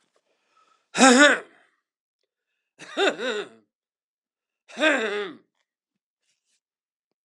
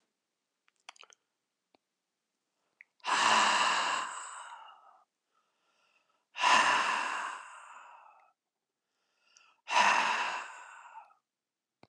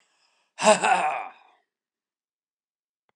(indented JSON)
{
  "three_cough_length": "7.2 s",
  "three_cough_amplitude": 30077,
  "three_cough_signal_mean_std_ratio": 0.28,
  "exhalation_length": "11.9 s",
  "exhalation_amplitude": 8138,
  "exhalation_signal_mean_std_ratio": 0.4,
  "cough_length": "3.2 s",
  "cough_amplitude": 21103,
  "cough_signal_mean_std_ratio": 0.32,
  "survey_phase": "beta (2021-08-13 to 2022-03-07)",
  "age": "65+",
  "gender": "Male",
  "wearing_mask": "No",
  "symptom_none": true,
  "smoker_status": "Never smoked",
  "respiratory_condition_asthma": false,
  "respiratory_condition_other": false,
  "recruitment_source": "REACT",
  "submission_delay": "4 days",
  "covid_test_result": "Negative",
  "covid_test_method": "RT-qPCR"
}